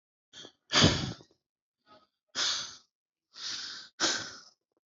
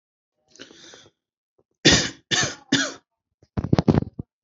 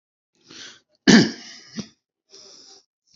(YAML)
exhalation_length: 4.9 s
exhalation_amplitude: 12299
exhalation_signal_mean_std_ratio: 0.37
three_cough_length: 4.4 s
three_cough_amplitude: 29439
three_cough_signal_mean_std_ratio: 0.33
cough_length: 3.2 s
cough_amplitude: 28127
cough_signal_mean_std_ratio: 0.24
survey_phase: alpha (2021-03-01 to 2021-08-12)
age: 18-44
gender: Male
wearing_mask: 'Yes'
symptom_none: true
smoker_status: Never smoked
respiratory_condition_asthma: false
respiratory_condition_other: false
recruitment_source: Test and Trace
submission_delay: 0 days
covid_test_result: Negative
covid_test_method: LFT